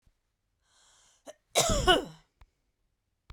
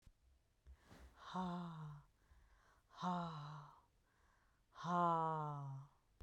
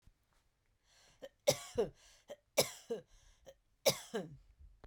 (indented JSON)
{
  "cough_length": "3.3 s",
  "cough_amplitude": 13910,
  "cough_signal_mean_std_ratio": 0.29,
  "exhalation_length": "6.2 s",
  "exhalation_amplitude": 1552,
  "exhalation_signal_mean_std_ratio": 0.52,
  "three_cough_length": "4.9 s",
  "three_cough_amplitude": 6203,
  "three_cough_signal_mean_std_ratio": 0.29,
  "survey_phase": "beta (2021-08-13 to 2022-03-07)",
  "age": "45-64",
  "gender": "Female",
  "wearing_mask": "No",
  "symptom_cough_any": true,
  "symptom_diarrhoea": true,
  "smoker_status": "Never smoked",
  "respiratory_condition_asthma": false,
  "respiratory_condition_other": false,
  "recruitment_source": "REACT",
  "submission_delay": "3 days",
  "covid_test_result": "Negative",
  "covid_test_method": "RT-qPCR"
}